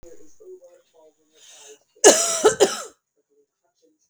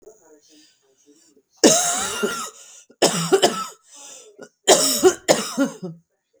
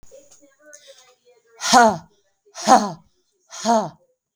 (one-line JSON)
{"cough_length": "4.1 s", "cough_amplitude": 32768, "cough_signal_mean_std_ratio": 0.29, "three_cough_length": "6.4 s", "three_cough_amplitude": 32768, "three_cough_signal_mean_std_ratio": 0.44, "exhalation_length": "4.4 s", "exhalation_amplitude": 32768, "exhalation_signal_mean_std_ratio": 0.33, "survey_phase": "beta (2021-08-13 to 2022-03-07)", "age": "45-64", "gender": "Female", "wearing_mask": "No", "symptom_shortness_of_breath": true, "symptom_fatigue": true, "symptom_headache": true, "smoker_status": "Ex-smoker", "respiratory_condition_asthma": false, "respiratory_condition_other": false, "recruitment_source": "REACT", "submission_delay": "4 days", "covid_test_result": "Negative", "covid_test_method": "RT-qPCR", "influenza_a_test_result": "Unknown/Void", "influenza_b_test_result": "Unknown/Void"}